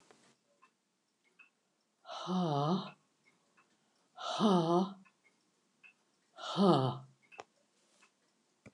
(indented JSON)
{
  "exhalation_length": "8.7 s",
  "exhalation_amplitude": 6186,
  "exhalation_signal_mean_std_ratio": 0.37,
  "survey_phase": "beta (2021-08-13 to 2022-03-07)",
  "age": "65+",
  "gender": "Female",
  "wearing_mask": "No",
  "symptom_cough_any": true,
  "smoker_status": "Never smoked",
  "respiratory_condition_asthma": false,
  "respiratory_condition_other": false,
  "recruitment_source": "REACT",
  "submission_delay": "2 days",
  "covid_test_result": "Negative",
  "covid_test_method": "RT-qPCR",
  "influenza_a_test_result": "Negative",
  "influenza_b_test_result": "Negative"
}